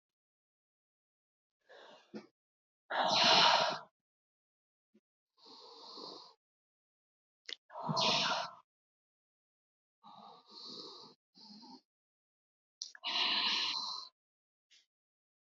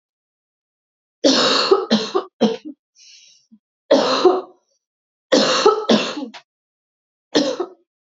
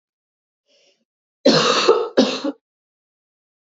{"exhalation_length": "15.4 s", "exhalation_amplitude": 7391, "exhalation_signal_mean_std_ratio": 0.34, "three_cough_length": "8.2 s", "three_cough_amplitude": 28751, "three_cough_signal_mean_std_ratio": 0.45, "cough_length": "3.7 s", "cough_amplitude": 27796, "cough_signal_mean_std_ratio": 0.38, "survey_phase": "beta (2021-08-13 to 2022-03-07)", "age": "18-44", "gender": "Female", "wearing_mask": "No", "symptom_cough_any": true, "symptom_new_continuous_cough": true, "symptom_runny_or_blocked_nose": true, "symptom_sore_throat": true, "symptom_diarrhoea": true, "symptom_fatigue": true, "symptom_fever_high_temperature": true, "symptom_headache": true, "symptom_onset": "1 day", "smoker_status": "Never smoked", "respiratory_condition_asthma": false, "respiratory_condition_other": false, "recruitment_source": "Test and Trace", "submission_delay": "1 day", "covid_test_result": "Positive", "covid_test_method": "ePCR"}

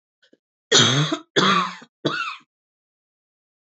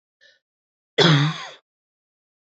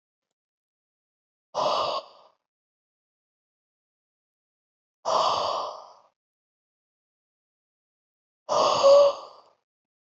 {"three_cough_length": "3.7 s", "three_cough_amplitude": 26916, "three_cough_signal_mean_std_ratio": 0.42, "cough_length": "2.6 s", "cough_amplitude": 25663, "cough_signal_mean_std_ratio": 0.32, "exhalation_length": "10.1 s", "exhalation_amplitude": 13753, "exhalation_signal_mean_std_ratio": 0.31, "survey_phase": "beta (2021-08-13 to 2022-03-07)", "age": "45-64", "gender": "Female", "wearing_mask": "No", "symptom_cough_any": true, "symptom_runny_or_blocked_nose": true, "symptom_sore_throat": true, "symptom_diarrhoea": true, "symptom_fatigue": true, "symptom_headache": true, "symptom_change_to_sense_of_smell_or_taste": true, "symptom_onset": "2 days", "smoker_status": "Never smoked", "respiratory_condition_asthma": false, "respiratory_condition_other": false, "recruitment_source": "Test and Trace", "submission_delay": "1 day", "covid_test_result": "Positive", "covid_test_method": "RT-qPCR", "covid_ct_value": 22.8, "covid_ct_gene": "ORF1ab gene"}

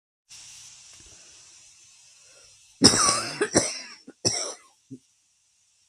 {"three_cough_length": "5.9 s", "three_cough_amplitude": 32766, "three_cough_signal_mean_std_ratio": 0.32, "survey_phase": "beta (2021-08-13 to 2022-03-07)", "age": "45-64", "gender": "Female", "wearing_mask": "No", "symptom_none": true, "smoker_status": "Current smoker (1 to 10 cigarettes per day)", "respiratory_condition_asthma": false, "respiratory_condition_other": false, "recruitment_source": "REACT", "submission_delay": "0 days", "covid_test_result": "Negative", "covid_test_method": "RT-qPCR", "influenza_a_test_result": "Negative", "influenza_b_test_result": "Negative"}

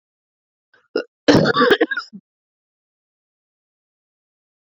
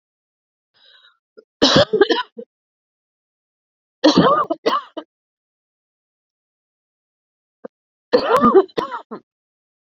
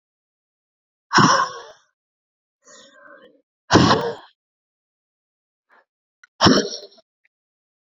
{"cough_length": "4.6 s", "cough_amplitude": 31230, "cough_signal_mean_std_ratio": 0.29, "three_cough_length": "9.9 s", "three_cough_amplitude": 32163, "three_cough_signal_mean_std_ratio": 0.32, "exhalation_length": "7.9 s", "exhalation_amplitude": 32768, "exhalation_signal_mean_std_ratio": 0.29, "survey_phase": "alpha (2021-03-01 to 2021-08-12)", "age": "18-44", "gender": "Female", "wearing_mask": "No", "symptom_cough_any": true, "symptom_new_continuous_cough": true, "symptom_fatigue": true, "symptom_fever_high_temperature": true, "symptom_headache": true, "symptom_change_to_sense_of_smell_or_taste": true, "symptom_loss_of_taste": true, "symptom_onset": "2 days", "smoker_status": "Current smoker (1 to 10 cigarettes per day)", "respiratory_condition_asthma": true, "respiratory_condition_other": false, "recruitment_source": "Test and Trace", "submission_delay": "2 days", "covid_test_method": "RT-qPCR"}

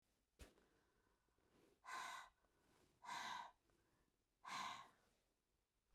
{"exhalation_length": "5.9 s", "exhalation_amplitude": 379, "exhalation_signal_mean_std_ratio": 0.43, "survey_phase": "beta (2021-08-13 to 2022-03-07)", "age": "65+", "gender": "Female", "wearing_mask": "No", "symptom_none": true, "smoker_status": "Ex-smoker", "respiratory_condition_asthma": false, "respiratory_condition_other": false, "recruitment_source": "REACT", "submission_delay": "1 day", "covid_test_result": "Negative", "covid_test_method": "RT-qPCR", "influenza_a_test_result": "Negative", "influenza_b_test_result": "Negative"}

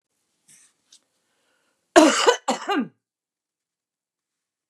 {"cough_length": "4.7 s", "cough_amplitude": 32767, "cough_signal_mean_std_ratio": 0.26, "survey_phase": "beta (2021-08-13 to 2022-03-07)", "age": "65+", "gender": "Female", "wearing_mask": "No", "symptom_cough_any": true, "smoker_status": "Current smoker (11 or more cigarettes per day)", "respiratory_condition_asthma": false, "respiratory_condition_other": false, "recruitment_source": "REACT", "submission_delay": "1 day", "covid_test_result": "Negative", "covid_test_method": "RT-qPCR", "influenza_a_test_result": "Negative", "influenza_b_test_result": "Negative"}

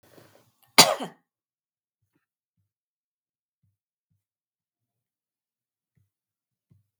{"cough_length": "7.0 s", "cough_amplitude": 32768, "cough_signal_mean_std_ratio": 0.11, "survey_phase": "beta (2021-08-13 to 2022-03-07)", "age": "18-44", "gender": "Female", "wearing_mask": "No", "symptom_none": true, "smoker_status": "Ex-smoker", "respiratory_condition_asthma": false, "respiratory_condition_other": false, "recruitment_source": "REACT", "submission_delay": "1 day", "covid_test_result": "Negative", "covid_test_method": "RT-qPCR", "influenza_a_test_result": "Negative", "influenza_b_test_result": "Negative"}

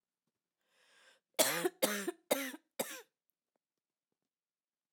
{"cough_length": "4.9 s", "cough_amplitude": 8007, "cough_signal_mean_std_ratio": 0.31, "survey_phase": "beta (2021-08-13 to 2022-03-07)", "age": "18-44", "gender": "Female", "wearing_mask": "No", "symptom_cough_any": true, "symptom_runny_or_blocked_nose": true, "symptom_onset": "3 days", "smoker_status": "Never smoked", "respiratory_condition_asthma": false, "respiratory_condition_other": false, "recruitment_source": "Test and Trace", "submission_delay": "1 day", "covid_test_result": "Positive", "covid_test_method": "RT-qPCR", "covid_ct_value": 18.1, "covid_ct_gene": "ORF1ab gene", "covid_ct_mean": 18.5, "covid_viral_load": "840000 copies/ml", "covid_viral_load_category": "Low viral load (10K-1M copies/ml)"}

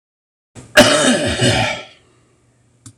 {"cough_length": "3.0 s", "cough_amplitude": 26028, "cough_signal_mean_std_ratio": 0.47, "survey_phase": "beta (2021-08-13 to 2022-03-07)", "age": "65+", "gender": "Male", "wearing_mask": "No", "symptom_cough_any": true, "symptom_runny_or_blocked_nose": true, "symptom_abdominal_pain": true, "symptom_fatigue": true, "symptom_headache": true, "symptom_onset": "4 days", "smoker_status": "Ex-smoker", "respiratory_condition_asthma": false, "respiratory_condition_other": false, "recruitment_source": "Test and Trace", "submission_delay": "1 day", "covid_test_result": "Positive", "covid_test_method": "RT-qPCR", "covid_ct_value": 18.2, "covid_ct_gene": "ORF1ab gene"}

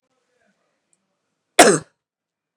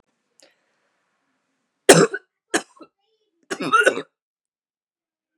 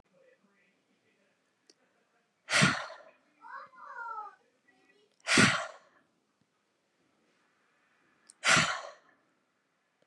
{"cough_length": "2.6 s", "cough_amplitude": 32768, "cough_signal_mean_std_ratio": 0.2, "three_cough_length": "5.4 s", "three_cough_amplitude": 32768, "three_cough_signal_mean_std_ratio": 0.24, "exhalation_length": "10.1 s", "exhalation_amplitude": 10861, "exhalation_signal_mean_std_ratio": 0.27, "survey_phase": "beta (2021-08-13 to 2022-03-07)", "age": "18-44", "gender": "Female", "wearing_mask": "No", "symptom_runny_or_blocked_nose": true, "symptom_fatigue": true, "symptom_onset": "7 days", "smoker_status": "Never smoked", "respiratory_condition_asthma": true, "respiratory_condition_other": false, "recruitment_source": "REACT", "submission_delay": "2 days", "covid_test_result": "Negative", "covid_test_method": "RT-qPCR", "influenza_a_test_result": "Negative", "influenza_b_test_result": "Negative"}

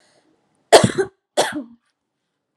{"cough_length": "2.6 s", "cough_amplitude": 32768, "cough_signal_mean_std_ratio": 0.28, "survey_phase": "alpha (2021-03-01 to 2021-08-12)", "age": "18-44", "gender": "Female", "wearing_mask": "No", "symptom_none": true, "smoker_status": "Never smoked", "respiratory_condition_asthma": true, "respiratory_condition_other": false, "recruitment_source": "Test and Trace", "submission_delay": "0 days", "covid_test_result": "Negative", "covid_test_method": "LFT"}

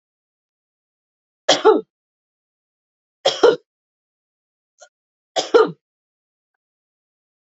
{"three_cough_length": "7.4 s", "three_cough_amplitude": 27599, "three_cough_signal_mean_std_ratio": 0.23, "survey_phase": "beta (2021-08-13 to 2022-03-07)", "age": "65+", "gender": "Female", "wearing_mask": "No", "symptom_none": true, "smoker_status": "Never smoked", "respiratory_condition_asthma": true, "respiratory_condition_other": false, "recruitment_source": "REACT", "submission_delay": "1 day", "covid_test_result": "Negative", "covid_test_method": "RT-qPCR", "influenza_a_test_result": "Negative", "influenza_b_test_result": "Negative"}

